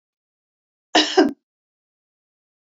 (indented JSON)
{
  "cough_length": "2.6 s",
  "cough_amplitude": 25894,
  "cough_signal_mean_std_ratio": 0.25,
  "survey_phase": "beta (2021-08-13 to 2022-03-07)",
  "age": "65+",
  "gender": "Female",
  "wearing_mask": "No",
  "symptom_none": true,
  "smoker_status": "Never smoked",
  "respiratory_condition_asthma": false,
  "respiratory_condition_other": false,
  "recruitment_source": "REACT",
  "submission_delay": "2 days",
  "covid_test_result": "Positive",
  "covid_test_method": "RT-qPCR",
  "covid_ct_value": 32.7,
  "covid_ct_gene": "N gene",
  "influenza_a_test_result": "Negative",
  "influenza_b_test_result": "Negative"
}